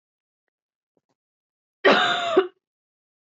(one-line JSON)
{"cough_length": "3.3 s", "cough_amplitude": 18266, "cough_signal_mean_std_ratio": 0.32, "survey_phase": "beta (2021-08-13 to 2022-03-07)", "age": "18-44", "gender": "Female", "wearing_mask": "No", "symptom_cough_any": true, "symptom_runny_or_blocked_nose": true, "symptom_shortness_of_breath": true, "symptom_sore_throat": true, "symptom_fatigue": true, "symptom_headache": true, "symptom_onset": "6 days", "smoker_status": "Ex-smoker", "respiratory_condition_asthma": false, "respiratory_condition_other": false, "recruitment_source": "Test and Trace", "submission_delay": "1 day", "covid_test_result": "Positive", "covid_test_method": "RT-qPCR", "covid_ct_value": 21.6, "covid_ct_gene": "ORF1ab gene"}